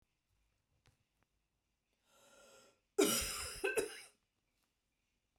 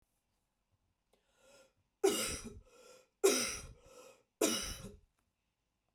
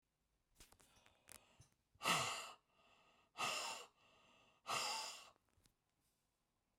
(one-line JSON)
{"cough_length": "5.4 s", "cough_amplitude": 3851, "cough_signal_mean_std_ratio": 0.29, "three_cough_length": "5.9 s", "three_cough_amplitude": 5560, "three_cough_signal_mean_std_ratio": 0.33, "exhalation_length": "6.8 s", "exhalation_amplitude": 2017, "exhalation_signal_mean_std_ratio": 0.38, "survey_phase": "beta (2021-08-13 to 2022-03-07)", "age": "45-64", "gender": "Female", "wearing_mask": "No", "symptom_none": true, "symptom_onset": "12 days", "smoker_status": "Ex-smoker", "respiratory_condition_asthma": false, "respiratory_condition_other": false, "recruitment_source": "REACT", "submission_delay": "2 days", "covid_test_result": "Negative", "covid_test_method": "RT-qPCR", "influenza_a_test_result": "Negative", "influenza_b_test_result": "Negative"}